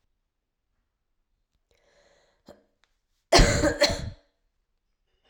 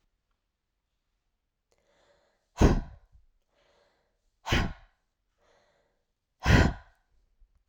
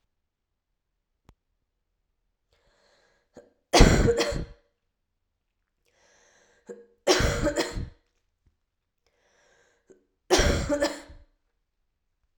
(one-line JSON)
{"cough_length": "5.3 s", "cough_amplitude": 21672, "cough_signal_mean_std_ratio": 0.26, "exhalation_length": "7.7 s", "exhalation_amplitude": 14245, "exhalation_signal_mean_std_ratio": 0.24, "three_cough_length": "12.4 s", "three_cough_amplitude": 27228, "three_cough_signal_mean_std_ratio": 0.29, "survey_phase": "alpha (2021-03-01 to 2021-08-12)", "age": "18-44", "gender": "Female", "wearing_mask": "No", "symptom_fatigue": true, "symptom_headache": true, "symptom_change_to_sense_of_smell_or_taste": true, "smoker_status": "Never smoked", "respiratory_condition_asthma": false, "respiratory_condition_other": false, "recruitment_source": "Test and Trace", "submission_delay": "1 day", "covid_test_result": "Positive", "covid_test_method": "RT-qPCR"}